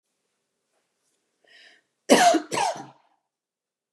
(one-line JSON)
{"cough_length": "3.9 s", "cough_amplitude": 25778, "cough_signal_mean_std_ratio": 0.28, "survey_phase": "beta (2021-08-13 to 2022-03-07)", "age": "45-64", "gender": "Female", "wearing_mask": "No", "symptom_none": true, "smoker_status": "Never smoked", "respiratory_condition_asthma": false, "respiratory_condition_other": false, "recruitment_source": "REACT", "submission_delay": "1 day", "covid_test_result": "Negative", "covid_test_method": "RT-qPCR", "influenza_a_test_result": "Negative", "influenza_b_test_result": "Negative"}